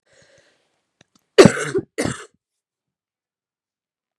{
  "cough_length": "4.2 s",
  "cough_amplitude": 32768,
  "cough_signal_mean_std_ratio": 0.2,
  "survey_phase": "beta (2021-08-13 to 2022-03-07)",
  "age": "18-44",
  "gender": "Female",
  "wearing_mask": "No",
  "symptom_new_continuous_cough": true,
  "symptom_shortness_of_breath": true,
  "symptom_diarrhoea": true,
  "symptom_fatigue": true,
  "symptom_headache": true,
  "symptom_change_to_sense_of_smell_or_taste": true,
  "symptom_loss_of_taste": true,
  "smoker_status": "Ex-smoker",
  "respiratory_condition_asthma": false,
  "respiratory_condition_other": false,
  "recruitment_source": "Test and Trace",
  "submission_delay": "4 days",
  "covid_test_result": "Positive",
  "covid_test_method": "LFT"
}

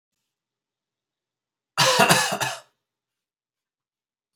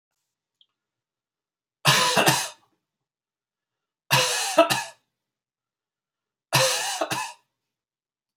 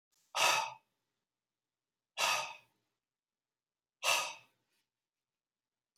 {
  "cough_length": "4.4 s",
  "cough_amplitude": 29116,
  "cough_signal_mean_std_ratio": 0.31,
  "three_cough_length": "8.4 s",
  "three_cough_amplitude": 29560,
  "three_cough_signal_mean_std_ratio": 0.36,
  "exhalation_length": "6.0 s",
  "exhalation_amplitude": 5600,
  "exhalation_signal_mean_std_ratio": 0.31,
  "survey_phase": "alpha (2021-03-01 to 2021-08-12)",
  "age": "45-64",
  "gender": "Male",
  "wearing_mask": "No",
  "symptom_none": true,
  "smoker_status": "Never smoked",
  "respiratory_condition_asthma": false,
  "respiratory_condition_other": false,
  "recruitment_source": "REACT",
  "submission_delay": "1 day",
  "covid_test_result": "Negative",
  "covid_test_method": "RT-qPCR"
}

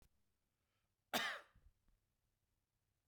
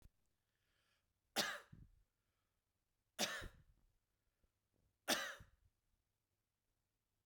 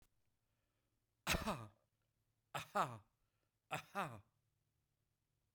{
  "cough_length": "3.1 s",
  "cough_amplitude": 1756,
  "cough_signal_mean_std_ratio": 0.24,
  "three_cough_length": "7.3 s",
  "three_cough_amplitude": 2279,
  "three_cough_signal_mean_std_ratio": 0.25,
  "exhalation_length": "5.5 s",
  "exhalation_amplitude": 2503,
  "exhalation_signal_mean_std_ratio": 0.3,
  "survey_phase": "beta (2021-08-13 to 2022-03-07)",
  "age": "45-64",
  "gender": "Male",
  "wearing_mask": "No",
  "symptom_none": true,
  "smoker_status": "Never smoked",
  "respiratory_condition_asthma": false,
  "respiratory_condition_other": false,
  "recruitment_source": "REACT",
  "submission_delay": "1 day",
  "covid_test_result": "Negative",
  "covid_test_method": "RT-qPCR",
  "influenza_a_test_result": "Negative",
  "influenza_b_test_result": "Negative"
}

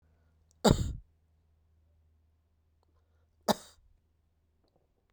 {
  "cough_length": "5.1 s",
  "cough_amplitude": 15254,
  "cough_signal_mean_std_ratio": 0.18,
  "survey_phase": "beta (2021-08-13 to 2022-03-07)",
  "age": "45-64",
  "gender": "Male",
  "wearing_mask": "No",
  "symptom_cough_any": true,
  "symptom_runny_or_blocked_nose": true,
  "symptom_abdominal_pain": true,
  "symptom_fever_high_temperature": true,
  "symptom_headache": true,
  "symptom_change_to_sense_of_smell_or_taste": true,
  "symptom_loss_of_taste": true,
  "smoker_status": "Never smoked",
  "respiratory_condition_asthma": false,
  "respiratory_condition_other": false,
  "recruitment_source": "Test and Trace",
  "submission_delay": "2 days",
  "covid_test_result": "Positive",
  "covid_test_method": "LFT"
}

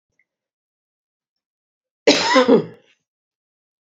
{
  "cough_length": "3.8 s",
  "cough_amplitude": 29227,
  "cough_signal_mean_std_ratio": 0.29,
  "survey_phase": "beta (2021-08-13 to 2022-03-07)",
  "age": "45-64",
  "gender": "Female",
  "wearing_mask": "No",
  "symptom_cough_any": true,
  "symptom_runny_or_blocked_nose": true,
  "symptom_fatigue": true,
  "symptom_headache": true,
  "symptom_onset": "4 days",
  "smoker_status": "Never smoked",
  "respiratory_condition_asthma": false,
  "respiratory_condition_other": false,
  "recruitment_source": "Test and Trace",
  "submission_delay": "1 day",
  "covid_test_result": "Positive",
  "covid_test_method": "ePCR"
}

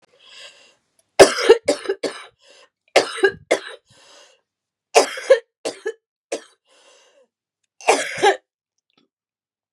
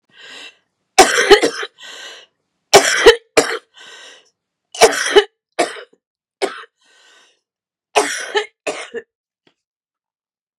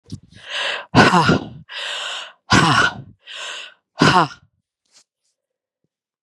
{
  "three_cough_length": "9.7 s",
  "three_cough_amplitude": 32768,
  "three_cough_signal_mean_std_ratio": 0.29,
  "cough_length": "10.6 s",
  "cough_amplitude": 32768,
  "cough_signal_mean_std_ratio": 0.32,
  "exhalation_length": "6.2 s",
  "exhalation_amplitude": 32768,
  "exhalation_signal_mean_std_ratio": 0.43,
  "survey_phase": "beta (2021-08-13 to 2022-03-07)",
  "age": "45-64",
  "gender": "Female",
  "wearing_mask": "No",
  "symptom_cough_any": true,
  "symptom_runny_or_blocked_nose": true,
  "symptom_sore_throat": true,
  "symptom_onset": "4 days",
  "smoker_status": "Ex-smoker",
  "respiratory_condition_asthma": false,
  "respiratory_condition_other": false,
  "recruitment_source": "Test and Trace",
  "submission_delay": "3 days",
  "covid_test_result": "Negative",
  "covid_test_method": "ePCR"
}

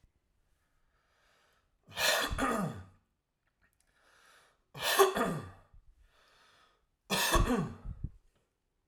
{
  "three_cough_length": "8.9 s",
  "three_cough_amplitude": 10015,
  "three_cough_signal_mean_std_ratio": 0.39,
  "survey_phase": "alpha (2021-03-01 to 2021-08-12)",
  "age": "18-44",
  "gender": "Male",
  "wearing_mask": "No",
  "symptom_none": true,
  "smoker_status": "Ex-smoker",
  "respiratory_condition_asthma": false,
  "respiratory_condition_other": false,
  "recruitment_source": "REACT",
  "submission_delay": "1 day",
  "covid_test_result": "Negative",
  "covid_test_method": "RT-qPCR"
}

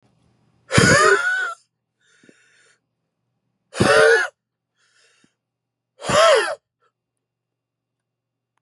{
  "exhalation_length": "8.6 s",
  "exhalation_amplitude": 32664,
  "exhalation_signal_mean_std_ratio": 0.36,
  "survey_phase": "beta (2021-08-13 to 2022-03-07)",
  "age": "45-64",
  "gender": "Male",
  "wearing_mask": "No",
  "symptom_cough_any": true,
  "symptom_new_continuous_cough": true,
  "symptom_shortness_of_breath": true,
  "symptom_sore_throat": true,
  "symptom_abdominal_pain": true,
  "symptom_diarrhoea": true,
  "symptom_fatigue": true,
  "symptom_headache": true,
  "smoker_status": "Never smoked",
  "respiratory_condition_asthma": false,
  "respiratory_condition_other": false,
  "recruitment_source": "Test and Trace",
  "submission_delay": "1 day",
  "covid_test_result": "Positive",
  "covid_test_method": "ePCR"
}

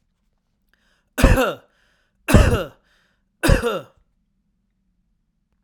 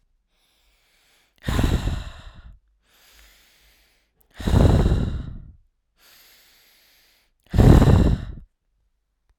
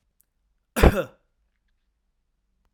{
  "three_cough_length": "5.6 s",
  "three_cough_amplitude": 32768,
  "three_cough_signal_mean_std_ratio": 0.32,
  "exhalation_length": "9.4 s",
  "exhalation_amplitude": 32767,
  "exhalation_signal_mean_std_ratio": 0.36,
  "cough_length": "2.7 s",
  "cough_amplitude": 32767,
  "cough_signal_mean_std_ratio": 0.2,
  "survey_phase": "alpha (2021-03-01 to 2021-08-12)",
  "age": "45-64",
  "gender": "Male",
  "wearing_mask": "No",
  "symptom_none": true,
  "smoker_status": "Never smoked",
  "respiratory_condition_asthma": false,
  "respiratory_condition_other": false,
  "recruitment_source": "REACT",
  "submission_delay": "1 day",
  "covid_test_result": "Negative",
  "covid_test_method": "RT-qPCR"
}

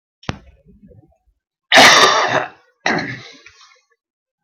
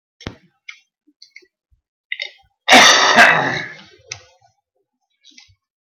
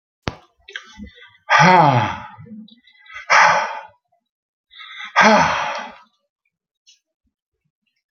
{
  "cough_length": "4.4 s",
  "cough_amplitude": 32768,
  "cough_signal_mean_std_ratio": 0.37,
  "three_cough_length": "5.8 s",
  "three_cough_amplitude": 32370,
  "three_cough_signal_mean_std_ratio": 0.33,
  "exhalation_length": "8.1 s",
  "exhalation_amplitude": 32768,
  "exhalation_signal_mean_std_ratio": 0.39,
  "survey_phase": "beta (2021-08-13 to 2022-03-07)",
  "age": "65+",
  "gender": "Male",
  "wearing_mask": "No",
  "symptom_cough_any": true,
  "symptom_runny_or_blocked_nose": true,
  "smoker_status": "Never smoked",
  "respiratory_condition_asthma": false,
  "respiratory_condition_other": false,
  "recruitment_source": "REACT",
  "submission_delay": "2 days",
  "covid_test_result": "Negative",
  "covid_test_method": "RT-qPCR"
}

